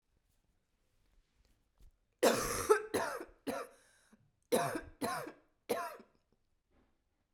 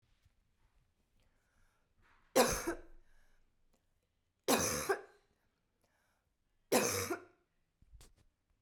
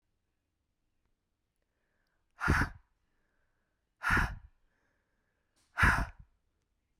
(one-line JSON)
{"cough_length": "7.3 s", "cough_amplitude": 7340, "cough_signal_mean_std_ratio": 0.36, "three_cough_length": "8.6 s", "three_cough_amplitude": 6355, "three_cough_signal_mean_std_ratio": 0.3, "exhalation_length": "7.0 s", "exhalation_amplitude": 7816, "exhalation_signal_mean_std_ratio": 0.28, "survey_phase": "beta (2021-08-13 to 2022-03-07)", "age": "18-44", "gender": "Female", "wearing_mask": "No", "symptom_cough_any": true, "symptom_new_continuous_cough": true, "symptom_fatigue": true, "symptom_headache": true, "smoker_status": "Never smoked", "respiratory_condition_asthma": false, "respiratory_condition_other": false, "recruitment_source": "Test and Trace", "submission_delay": "1 day", "covid_test_result": "Positive", "covid_test_method": "LFT"}